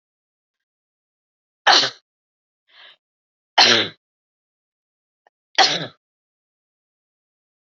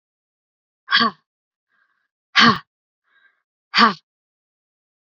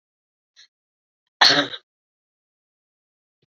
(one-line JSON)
{"three_cough_length": "7.8 s", "three_cough_amplitude": 32768, "three_cough_signal_mean_std_ratio": 0.23, "exhalation_length": "5.0 s", "exhalation_amplitude": 29115, "exhalation_signal_mean_std_ratio": 0.26, "cough_length": "3.6 s", "cough_amplitude": 27942, "cough_signal_mean_std_ratio": 0.2, "survey_phase": "beta (2021-08-13 to 2022-03-07)", "age": "18-44", "gender": "Female", "wearing_mask": "No", "symptom_cough_any": true, "smoker_status": "Never smoked", "respiratory_condition_asthma": false, "respiratory_condition_other": false, "recruitment_source": "REACT", "submission_delay": "2 days", "covid_test_result": "Negative", "covid_test_method": "RT-qPCR", "influenza_a_test_result": "Negative", "influenza_b_test_result": "Negative"}